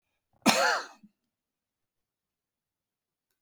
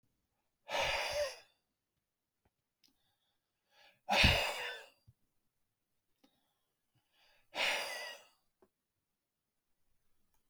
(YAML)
cough_length: 3.4 s
cough_amplitude: 19296
cough_signal_mean_std_ratio: 0.25
exhalation_length: 10.5 s
exhalation_amplitude: 6208
exhalation_signal_mean_std_ratio: 0.31
survey_phase: beta (2021-08-13 to 2022-03-07)
age: 65+
gender: Male
wearing_mask: 'No'
symptom_cough_any: true
smoker_status: Never smoked
respiratory_condition_asthma: true
respiratory_condition_other: false
recruitment_source: REACT
submission_delay: 2 days
covid_test_result: Negative
covid_test_method: RT-qPCR